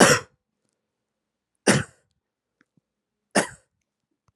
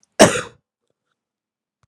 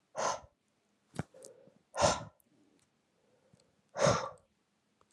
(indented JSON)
{
  "three_cough_length": "4.4 s",
  "three_cough_amplitude": 30630,
  "three_cough_signal_mean_std_ratio": 0.23,
  "cough_length": "1.9 s",
  "cough_amplitude": 32768,
  "cough_signal_mean_std_ratio": 0.22,
  "exhalation_length": "5.1 s",
  "exhalation_amplitude": 6658,
  "exhalation_signal_mean_std_ratio": 0.31,
  "survey_phase": "beta (2021-08-13 to 2022-03-07)",
  "age": "18-44",
  "gender": "Male",
  "wearing_mask": "Yes",
  "symptom_cough_any": true,
  "symptom_runny_or_blocked_nose": true,
  "symptom_headache": true,
  "symptom_change_to_sense_of_smell_or_taste": true,
  "symptom_loss_of_taste": true,
  "symptom_onset": "13 days",
  "smoker_status": "Never smoked",
  "respiratory_condition_asthma": false,
  "respiratory_condition_other": false,
  "recruitment_source": "Test and Trace",
  "submission_delay": "1 day",
  "covid_test_result": "Positive",
  "covid_test_method": "ePCR"
}